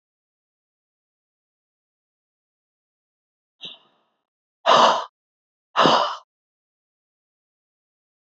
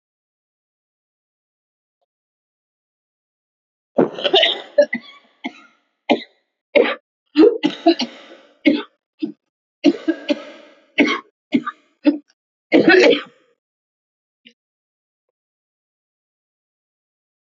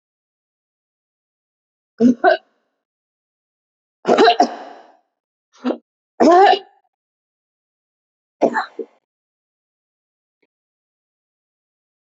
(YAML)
exhalation_length: 8.3 s
exhalation_amplitude: 26198
exhalation_signal_mean_std_ratio: 0.23
cough_length: 17.5 s
cough_amplitude: 29104
cough_signal_mean_std_ratio: 0.3
three_cough_length: 12.0 s
three_cough_amplitude: 28851
three_cough_signal_mean_std_ratio: 0.26
survey_phase: beta (2021-08-13 to 2022-03-07)
age: 65+
gender: Female
wearing_mask: 'No'
symptom_cough_any: true
symptom_sore_throat: true
symptom_onset: 12 days
smoker_status: Never smoked
respiratory_condition_asthma: false
respiratory_condition_other: false
recruitment_source: REACT
submission_delay: 3 days
covid_test_result: Negative
covid_test_method: RT-qPCR
influenza_a_test_result: Negative
influenza_b_test_result: Negative